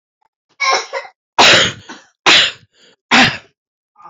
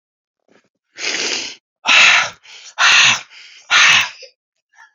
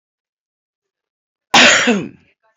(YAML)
three_cough_length: 4.1 s
three_cough_amplitude: 31573
three_cough_signal_mean_std_ratio: 0.44
exhalation_length: 4.9 s
exhalation_amplitude: 32767
exhalation_signal_mean_std_ratio: 0.47
cough_length: 2.6 s
cough_amplitude: 31014
cough_signal_mean_std_ratio: 0.35
survey_phase: beta (2021-08-13 to 2022-03-07)
age: 65+
gender: Male
wearing_mask: 'Yes'
symptom_cough_any: true
smoker_status: Never smoked
respiratory_condition_asthma: false
respiratory_condition_other: false
recruitment_source: Test and Trace
submission_delay: 2 days
covid_test_result: Positive
covid_test_method: RT-qPCR
covid_ct_value: 22.9
covid_ct_gene: S gene
covid_ct_mean: 23.7
covid_viral_load: 17000 copies/ml
covid_viral_load_category: Low viral load (10K-1M copies/ml)